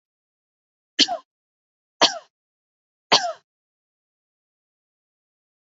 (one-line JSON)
{"three_cough_length": "5.7 s", "three_cough_amplitude": 25918, "three_cough_signal_mean_std_ratio": 0.19, "survey_phase": "beta (2021-08-13 to 2022-03-07)", "age": "45-64", "gender": "Female", "wearing_mask": "No", "symptom_none": true, "smoker_status": "Never smoked", "respiratory_condition_asthma": false, "respiratory_condition_other": false, "recruitment_source": "Test and Trace", "submission_delay": "1 day", "covid_test_result": "Negative", "covid_test_method": "RT-qPCR"}